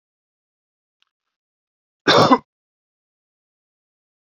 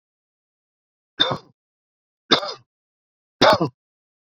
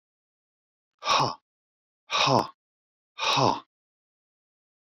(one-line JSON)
{"cough_length": "4.4 s", "cough_amplitude": 28354, "cough_signal_mean_std_ratio": 0.21, "three_cough_length": "4.3 s", "three_cough_amplitude": 30928, "three_cough_signal_mean_std_ratio": 0.26, "exhalation_length": "4.9 s", "exhalation_amplitude": 15432, "exhalation_signal_mean_std_ratio": 0.35, "survey_phase": "beta (2021-08-13 to 2022-03-07)", "age": "45-64", "gender": "Male", "wearing_mask": "No", "symptom_none": true, "smoker_status": "Never smoked", "respiratory_condition_asthma": false, "respiratory_condition_other": false, "recruitment_source": "REACT", "submission_delay": "1 day", "covid_test_result": "Negative", "covid_test_method": "RT-qPCR"}